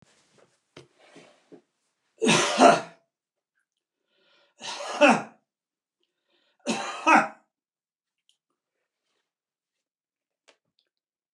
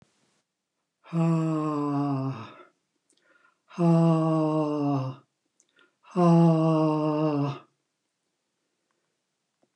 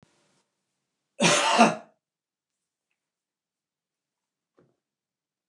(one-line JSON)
{"three_cough_length": "11.3 s", "three_cough_amplitude": 23995, "three_cough_signal_mean_std_ratio": 0.25, "exhalation_length": "9.8 s", "exhalation_amplitude": 10197, "exhalation_signal_mean_std_ratio": 0.56, "cough_length": "5.5 s", "cough_amplitude": 22754, "cough_signal_mean_std_ratio": 0.24, "survey_phase": "beta (2021-08-13 to 2022-03-07)", "age": "65+", "gender": "Male", "wearing_mask": "No", "symptom_none": true, "smoker_status": "Never smoked", "respiratory_condition_asthma": false, "respiratory_condition_other": false, "recruitment_source": "REACT", "submission_delay": "3 days", "covid_test_result": "Negative", "covid_test_method": "RT-qPCR", "influenza_a_test_result": "Negative", "influenza_b_test_result": "Negative"}